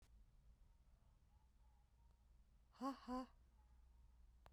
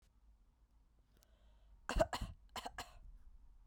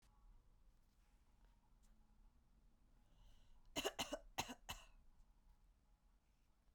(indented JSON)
{
  "exhalation_length": "4.5 s",
  "exhalation_amplitude": 501,
  "exhalation_signal_mean_std_ratio": 0.42,
  "cough_length": "3.7 s",
  "cough_amplitude": 3658,
  "cough_signal_mean_std_ratio": 0.33,
  "three_cough_length": "6.7 s",
  "three_cough_amplitude": 1598,
  "three_cough_signal_mean_std_ratio": 0.36,
  "survey_phase": "beta (2021-08-13 to 2022-03-07)",
  "age": "18-44",
  "gender": "Female",
  "wearing_mask": "No",
  "symptom_change_to_sense_of_smell_or_taste": true,
  "symptom_loss_of_taste": true,
  "symptom_onset": "4 days",
  "smoker_status": "Never smoked",
  "respiratory_condition_asthma": false,
  "respiratory_condition_other": false,
  "recruitment_source": "Test and Trace",
  "submission_delay": "4 days",
  "covid_test_result": "Positive",
  "covid_test_method": "RT-qPCR",
  "covid_ct_value": 20.9,
  "covid_ct_gene": "ORF1ab gene",
  "covid_ct_mean": 21.5,
  "covid_viral_load": "90000 copies/ml",
  "covid_viral_load_category": "Low viral load (10K-1M copies/ml)"
}